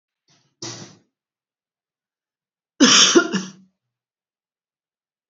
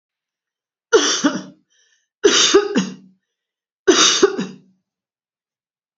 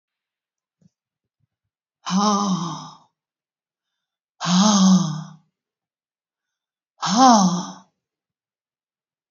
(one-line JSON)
{"cough_length": "5.3 s", "cough_amplitude": 30696, "cough_signal_mean_std_ratio": 0.26, "three_cough_length": "6.0 s", "three_cough_amplitude": 30123, "three_cough_signal_mean_std_ratio": 0.4, "exhalation_length": "9.3 s", "exhalation_amplitude": 29114, "exhalation_signal_mean_std_ratio": 0.38, "survey_phase": "beta (2021-08-13 to 2022-03-07)", "age": "65+", "gender": "Female", "wearing_mask": "No", "symptom_none": true, "smoker_status": "Ex-smoker", "respiratory_condition_asthma": false, "respiratory_condition_other": false, "recruitment_source": "REACT", "submission_delay": "1 day", "covid_test_result": "Negative", "covid_test_method": "RT-qPCR", "influenza_a_test_result": "Negative", "influenza_b_test_result": "Negative"}